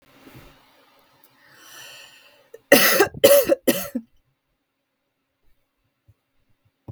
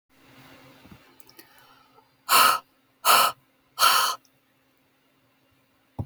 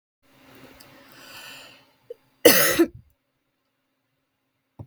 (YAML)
three_cough_length: 6.9 s
three_cough_amplitude: 32766
three_cough_signal_mean_std_ratio: 0.28
exhalation_length: 6.1 s
exhalation_amplitude: 23288
exhalation_signal_mean_std_ratio: 0.32
cough_length: 4.9 s
cough_amplitude: 32768
cough_signal_mean_std_ratio: 0.24
survey_phase: beta (2021-08-13 to 2022-03-07)
age: 18-44
gender: Female
wearing_mask: 'No'
symptom_sore_throat: true
symptom_fatigue: true
symptom_headache: true
symptom_onset: 12 days
smoker_status: Never smoked
respiratory_condition_asthma: false
respiratory_condition_other: false
recruitment_source: REACT
submission_delay: 1 day
covid_test_result: Negative
covid_test_method: RT-qPCR
influenza_a_test_result: Negative
influenza_b_test_result: Negative